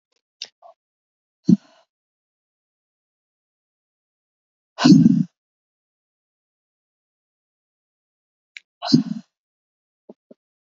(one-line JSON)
{"exhalation_length": "10.7 s", "exhalation_amplitude": 28586, "exhalation_signal_mean_std_ratio": 0.19, "survey_phase": "alpha (2021-03-01 to 2021-08-12)", "age": "18-44", "gender": "Female", "wearing_mask": "No", "symptom_shortness_of_breath": true, "symptom_abdominal_pain": true, "symptom_fatigue": true, "symptom_change_to_sense_of_smell_or_taste": true, "symptom_onset": "4 days", "smoker_status": "Never smoked", "respiratory_condition_asthma": true, "respiratory_condition_other": false, "recruitment_source": "Test and Trace", "submission_delay": "2 days", "covid_test_result": "Positive", "covid_test_method": "RT-qPCR"}